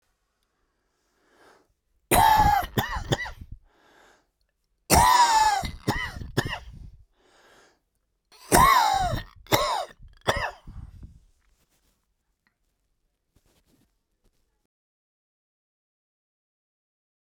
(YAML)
three_cough_length: 17.2 s
three_cough_amplitude: 26686
three_cough_signal_mean_std_ratio: 0.35
survey_phase: beta (2021-08-13 to 2022-03-07)
age: 45-64
gender: Male
wearing_mask: 'No'
symptom_none: true
smoker_status: Ex-smoker
respiratory_condition_asthma: true
respiratory_condition_other: true
recruitment_source: REACT
submission_delay: 6 days
covid_test_result: Negative
covid_test_method: RT-qPCR